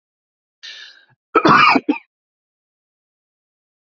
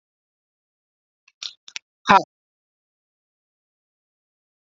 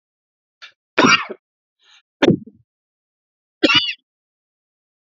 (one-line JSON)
{"cough_length": "3.9 s", "cough_amplitude": 28678, "cough_signal_mean_std_ratio": 0.29, "exhalation_length": "4.7 s", "exhalation_amplitude": 32768, "exhalation_signal_mean_std_ratio": 0.13, "three_cough_length": "5.0 s", "three_cough_amplitude": 32768, "three_cough_signal_mean_std_ratio": 0.28, "survey_phase": "beta (2021-08-13 to 2022-03-07)", "age": "45-64", "gender": "Male", "wearing_mask": "No", "symptom_cough_any": true, "symptom_onset": "12 days", "smoker_status": "Never smoked", "respiratory_condition_asthma": false, "respiratory_condition_other": false, "recruitment_source": "REACT", "submission_delay": "2 days", "covid_test_result": "Negative", "covid_test_method": "RT-qPCR", "influenza_a_test_result": "Unknown/Void", "influenza_b_test_result": "Unknown/Void"}